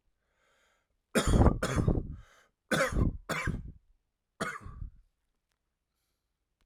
{"three_cough_length": "6.7 s", "three_cough_amplitude": 12051, "three_cough_signal_mean_std_ratio": 0.39, "survey_phase": "alpha (2021-03-01 to 2021-08-12)", "age": "18-44", "gender": "Male", "wearing_mask": "No", "symptom_cough_any": true, "symptom_headache": true, "symptom_onset": "8 days", "smoker_status": "Never smoked", "respiratory_condition_asthma": false, "respiratory_condition_other": false, "recruitment_source": "Test and Trace", "submission_delay": "1 day", "covid_test_result": "Positive", "covid_test_method": "RT-qPCR"}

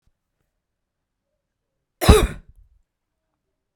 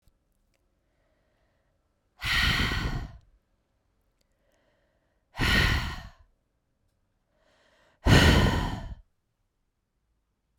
{"cough_length": "3.8 s", "cough_amplitude": 32768, "cough_signal_mean_std_ratio": 0.19, "exhalation_length": "10.6 s", "exhalation_amplitude": 15932, "exhalation_signal_mean_std_ratio": 0.34, "survey_phase": "beta (2021-08-13 to 2022-03-07)", "age": "18-44", "gender": "Female", "wearing_mask": "No", "symptom_cough_any": true, "symptom_runny_or_blocked_nose": true, "symptom_fatigue": true, "symptom_change_to_sense_of_smell_or_taste": true, "symptom_loss_of_taste": true, "symptom_onset": "6 days", "smoker_status": "Ex-smoker", "respiratory_condition_asthma": false, "respiratory_condition_other": false, "recruitment_source": "Test and Trace", "submission_delay": "2 days", "covid_test_method": "RT-qPCR", "covid_ct_value": 30.3, "covid_ct_gene": "ORF1ab gene"}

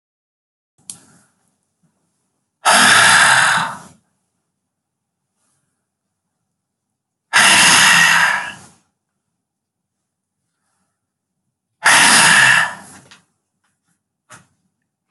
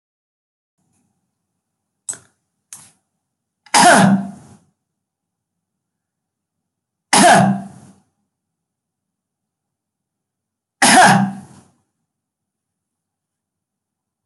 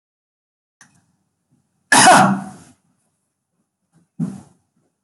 {"exhalation_length": "15.1 s", "exhalation_amplitude": 32768, "exhalation_signal_mean_std_ratio": 0.38, "three_cough_length": "14.3 s", "three_cough_amplitude": 32768, "three_cough_signal_mean_std_ratio": 0.27, "cough_length": "5.0 s", "cough_amplitude": 32768, "cough_signal_mean_std_ratio": 0.27, "survey_phase": "beta (2021-08-13 to 2022-03-07)", "age": "65+", "gender": "Female", "wearing_mask": "No", "symptom_other": true, "smoker_status": "Ex-smoker", "respiratory_condition_asthma": false, "respiratory_condition_other": false, "recruitment_source": "REACT", "submission_delay": "6 days", "covid_test_result": "Negative", "covid_test_method": "RT-qPCR"}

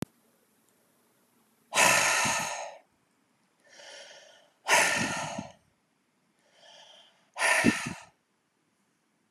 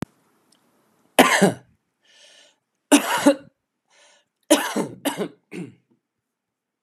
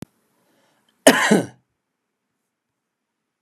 {"exhalation_length": "9.3 s", "exhalation_amplitude": 13080, "exhalation_signal_mean_std_ratio": 0.38, "three_cough_length": "6.8 s", "three_cough_amplitude": 32767, "three_cough_signal_mean_std_ratio": 0.3, "cough_length": "3.4 s", "cough_amplitude": 32768, "cough_signal_mean_std_ratio": 0.23, "survey_phase": "beta (2021-08-13 to 2022-03-07)", "age": "45-64", "gender": "Male", "wearing_mask": "No", "symptom_none": true, "smoker_status": "Never smoked", "respiratory_condition_asthma": false, "respiratory_condition_other": false, "recruitment_source": "REACT", "submission_delay": "1 day", "covid_test_result": "Negative", "covid_test_method": "RT-qPCR", "influenza_a_test_result": "Unknown/Void", "influenza_b_test_result": "Unknown/Void"}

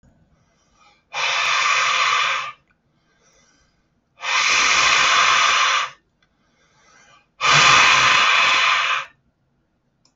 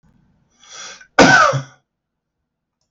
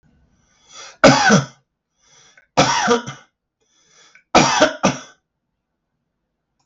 {"exhalation_length": "10.2 s", "exhalation_amplitude": 30078, "exhalation_signal_mean_std_ratio": 0.6, "cough_length": "2.9 s", "cough_amplitude": 32768, "cough_signal_mean_std_ratio": 0.32, "three_cough_length": "6.7 s", "three_cough_amplitude": 32768, "three_cough_signal_mean_std_ratio": 0.35, "survey_phase": "beta (2021-08-13 to 2022-03-07)", "age": "65+", "gender": "Male", "wearing_mask": "No", "symptom_none": true, "smoker_status": "Ex-smoker", "respiratory_condition_asthma": false, "respiratory_condition_other": false, "recruitment_source": "REACT", "submission_delay": "2 days", "covid_test_result": "Negative", "covid_test_method": "RT-qPCR", "influenza_a_test_result": "Negative", "influenza_b_test_result": "Negative"}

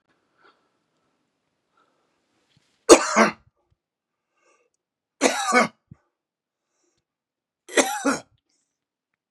{"three_cough_length": "9.3 s", "three_cough_amplitude": 32768, "three_cough_signal_mean_std_ratio": 0.23, "survey_phase": "beta (2021-08-13 to 2022-03-07)", "age": "45-64", "gender": "Male", "wearing_mask": "No", "symptom_sore_throat": true, "symptom_headache": true, "symptom_other": true, "smoker_status": "Never smoked", "respiratory_condition_asthma": false, "respiratory_condition_other": false, "recruitment_source": "Test and Trace", "submission_delay": "2 days", "covid_test_result": "Positive", "covid_test_method": "RT-qPCR", "covid_ct_value": 19.2, "covid_ct_gene": "ORF1ab gene", "covid_ct_mean": 19.9, "covid_viral_load": "290000 copies/ml", "covid_viral_load_category": "Low viral load (10K-1M copies/ml)"}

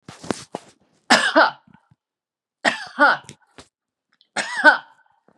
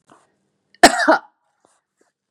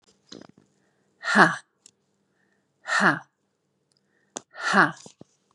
{"three_cough_length": "5.4 s", "three_cough_amplitude": 32433, "three_cough_signal_mean_std_ratio": 0.33, "cough_length": "2.3 s", "cough_amplitude": 32768, "cough_signal_mean_std_ratio": 0.25, "exhalation_length": "5.5 s", "exhalation_amplitude": 31753, "exhalation_signal_mean_std_ratio": 0.28, "survey_phase": "beta (2021-08-13 to 2022-03-07)", "age": "45-64", "gender": "Female", "wearing_mask": "No", "symptom_none": true, "smoker_status": "Never smoked", "respiratory_condition_asthma": false, "respiratory_condition_other": false, "recruitment_source": "REACT", "submission_delay": "1 day", "covid_test_result": "Negative", "covid_test_method": "RT-qPCR", "influenza_a_test_result": "Unknown/Void", "influenza_b_test_result": "Unknown/Void"}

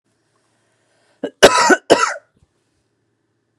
{"cough_length": "3.6 s", "cough_amplitude": 32768, "cough_signal_mean_std_ratio": 0.29, "survey_phase": "beta (2021-08-13 to 2022-03-07)", "age": "18-44", "gender": "Female", "wearing_mask": "No", "symptom_cough_any": true, "symptom_runny_or_blocked_nose": true, "symptom_sore_throat": true, "symptom_onset": "12 days", "smoker_status": "Never smoked", "respiratory_condition_asthma": false, "respiratory_condition_other": false, "recruitment_source": "REACT", "submission_delay": "1 day", "covid_test_result": "Negative", "covid_test_method": "RT-qPCR", "influenza_a_test_result": "Unknown/Void", "influenza_b_test_result": "Unknown/Void"}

